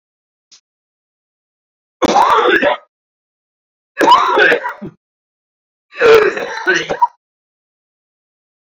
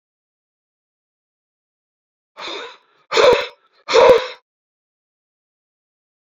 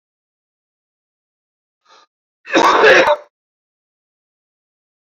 {
  "three_cough_length": "8.7 s",
  "three_cough_amplitude": 32768,
  "three_cough_signal_mean_std_ratio": 0.42,
  "exhalation_length": "6.4 s",
  "exhalation_amplitude": 32102,
  "exhalation_signal_mean_std_ratio": 0.27,
  "cough_length": "5.0 s",
  "cough_amplitude": 29652,
  "cough_signal_mean_std_ratio": 0.29,
  "survey_phase": "beta (2021-08-13 to 2022-03-07)",
  "age": "45-64",
  "gender": "Male",
  "wearing_mask": "No",
  "symptom_new_continuous_cough": true,
  "symptom_shortness_of_breath": true,
  "symptom_sore_throat": true,
  "symptom_fatigue": true,
  "symptom_headache": true,
  "symptom_onset": "3 days",
  "smoker_status": "Never smoked",
  "respiratory_condition_asthma": true,
  "respiratory_condition_other": false,
  "recruitment_source": "Test and Trace",
  "submission_delay": "2 days",
  "covid_test_result": "Positive",
  "covid_test_method": "RT-qPCR",
  "covid_ct_value": 16.8,
  "covid_ct_gene": "ORF1ab gene",
  "covid_ct_mean": 17.2,
  "covid_viral_load": "2200000 copies/ml",
  "covid_viral_load_category": "High viral load (>1M copies/ml)"
}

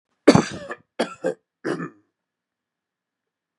{
  "cough_length": "3.6 s",
  "cough_amplitude": 32129,
  "cough_signal_mean_std_ratio": 0.25,
  "survey_phase": "beta (2021-08-13 to 2022-03-07)",
  "age": "45-64",
  "gender": "Male",
  "wearing_mask": "No",
  "symptom_fatigue": true,
  "symptom_onset": "11 days",
  "smoker_status": "Ex-smoker",
  "respiratory_condition_asthma": false,
  "respiratory_condition_other": false,
  "recruitment_source": "REACT",
  "submission_delay": "1 day",
  "covid_test_result": "Negative",
  "covid_test_method": "RT-qPCR",
  "influenza_a_test_result": "Negative",
  "influenza_b_test_result": "Negative"
}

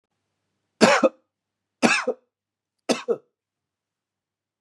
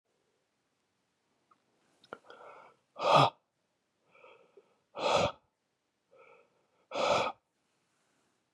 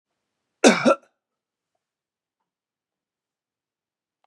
{
  "three_cough_length": "4.6 s",
  "three_cough_amplitude": 31987,
  "three_cough_signal_mean_std_ratio": 0.28,
  "exhalation_length": "8.5 s",
  "exhalation_amplitude": 10585,
  "exhalation_signal_mean_std_ratio": 0.27,
  "cough_length": "4.3 s",
  "cough_amplitude": 32027,
  "cough_signal_mean_std_ratio": 0.18,
  "survey_phase": "beta (2021-08-13 to 2022-03-07)",
  "age": "45-64",
  "gender": "Male",
  "wearing_mask": "No",
  "symptom_none": true,
  "smoker_status": "Never smoked",
  "respiratory_condition_asthma": false,
  "respiratory_condition_other": false,
  "recruitment_source": "REACT",
  "submission_delay": "2 days",
  "covid_test_result": "Negative",
  "covid_test_method": "RT-qPCR",
  "influenza_a_test_result": "Unknown/Void",
  "influenza_b_test_result": "Unknown/Void"
}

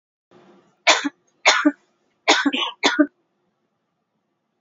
{
  "three_cough_length": "4.6 s",
  "three_cough_amplitude": 29918,
  "three_cough_signal_mean_std_ratio": 0.35,
  "survey_phase": "beta (2021-08-13 to 2022-03-07)",
  "age": "45-64",
  "gender": "Female",
  "wearing_mask": "Yes",
  "symptom_none": true,
  "smoker_status": "Ex-smoker",
  "respiratory_condition_asthma": false,
  "respiratory_condition_other": false,
  "recruitment_source": "REACT",
  "submission_delay": "3 days",
  "covid_test_result": "Negative",
  "covid_test_method": "RT-qPCR",
  "influenza_a_test_result": "Negative",
  "influenza_b_test_result": "Negative"
}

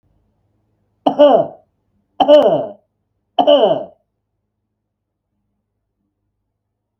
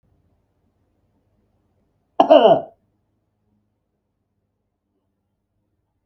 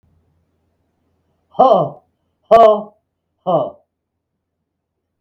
{
  "three_cough_length": "7.0 s",
  "three_cough_amplitude": 32768,
  "three_cough_signal_mean_std_ratio": 0.33,
  "cough_length": "6.1 s",
  "cough_amplitude": 32768,
  "cough_signal_mean_std_ratio": 0.19,
  "exhalation_length": "5.2 s",
  "exhalation_amplitude": 32768,
  "exhalation_signal_mean_std_ratio": 0.31,
  "survey_phase": "beta (2021-08-13 to 2022-03-07)",
  "age": "65+",
  "gender": "Male",
  "wearing_mask": "No",
  "symptom_none": true,
  "smoker_status": "Ex-smoker",
  "respiratory_condition_asthma": false,
  "respiratory_condition_other": false,
  "recruitment_source": "REACT",
  "submission_delay": "1 day",
  "covid_test_result": "Negative",
  "covid_test_method": "RT-qPCR",
  "influenza_a_test_result": "Negative",
  "influenza_b_test_result": "Negative"
}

